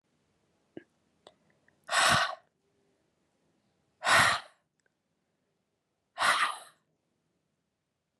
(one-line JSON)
{"exhalation_length": "8.2 s", "exhalation_amplitude": 9510, "exhalation_signal_mean_std_ratio": 0.29, "survey_phase": "beta (2021-08-13 to 2022-03-07)", "age": "18-44", "gender": "Female", "wearing_mask": "No", "symptom_cough_any": true, "symptom_runny_or_blocked_nose": true, "symptom_sore_throat": true, "symptom_fatigue": true, "symptom_headache": true, "symptom_change_to_sense_of_smell_or_taste": true, "smoker_status": "Never smoked", "respiratory_condition_asthma": false, "respiratory_condition_other": false, "recruitment_source": "Test and Trace", "submission_delay": "2 days", "covid_test_result": "Positive", "covid_test_method": "RT-qPCR", "covid_ct_value": 32.5, "covid_ct_gene": "ORF1ab gene", "covid_ct_mean": 32.5, "covid_viral_load": "22 copies/ml", "covid_viral_load_category": "Minimal viral load (< 10K copies/ml)"}